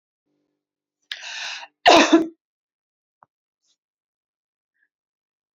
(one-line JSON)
{"cough_length": "5.5 s", "cough_amplitude": 27934, "cough_signal_mean_std_ratio": 0.22, "survey_phase": "alpha (2021-03-01 to 2021-08-12)", "age": "45-64", "gender": "Female", "wearing_mask": "No", "symptom_none": true, "smoker_status": "Ex-smoker", "respiratory_condition_asthma": false, "respiratory_condition_other": false, "recruitment_source": "REACT", "submission_delay": "1 day", "covid_test_result": "Negative", "covid_test_method": "RT-qPCR"}